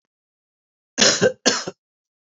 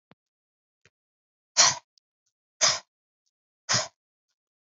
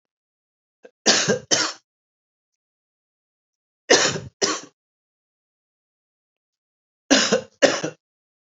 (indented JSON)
{
  "cough_length": "2.3 s",
  "cough_amplitude": 26797,
  "cough_signal_mean_std_ratio": 0.35,
  "exhalation_length": "4.7 s",
  "exhalation_amplitude": 21336,
  "exhalation_signal_mean_std_ratio": 0.24,
  "three_cough_length": "8.4 s",
  "three_cough_amplitude": 32509,
  "three_cough_signal_mean_std_ratio": 0.31,
  "survey_phase": "beta (2021-08-13 to 2022-03-07)",
  "age": "45-64",
  "gender": "Male",
  "wearing_mask": "No",
  "symptom_cough_any": true,
  "symptom_runny_or_blocked_nose": true,
  "symptom_sore_throat": true,
  "symptom_fever_high_temperature": true,
  "symptom_onset": "3 days",
  "smoker_status": "Never smoked",
  "respiratory_condition_asthma": false,
  "respiratory_condition_other": false,
  "recruitment_source": "Test and Trace",
  "submission_delay": "2 days",
  "covid_test_result": "Positive",
  "covid_test_method": "ePCR"
}